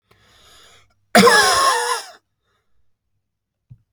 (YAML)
cough_length: 3.9 s
cough_amplitude: 32767
cough_signal_mean_std_ratio: 0.37
survey_phase: beta (2021-08-13 to 2022-03-07)
age: 45-64
gender: Male
wearing_mask: 'No'
symptom_none: true
smoker_status: Never smoked
respiratory_condition_asthma: false
respiratory_condition_other: false
recruitment_source: REACT
submission_delay: 2 days
covid_test_result: Negative
covid_test_method: RT-qPCR